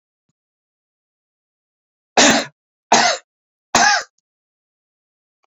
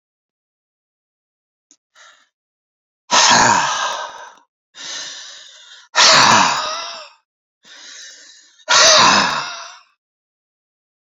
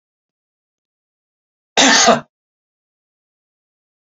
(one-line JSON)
{"three_cough_length": "5.5 s", "three_cough_amplitude": 30517, "three_cough_signal_mean_std_ratio": 0.3, "exhalation_length": "11.2 s", "exhalation_amplitude": 31969, "exhalation_signal_mean_std_ratio": 0.4, "cough_length": "4.0 s", "cough_amplitude": 31714, "cough_signal_mean_std_ratio": 0.26, "survey_phase": "beta (2021-08-13 to 2022-03-07)", "age": "65+", "gender": "Male", "wearing_mask": "No", "symptom_none": true, "symptom_onset": "8 days", "smoker_status": "Ex-smoker", "respiratory_condition_asthma": false, "respiratory_condition_other": false, "recruitment_source": "REACT", "submission_delay": "4 days", "covid_test_result": "Negative", "covid_test_method": "RT-qPCR"}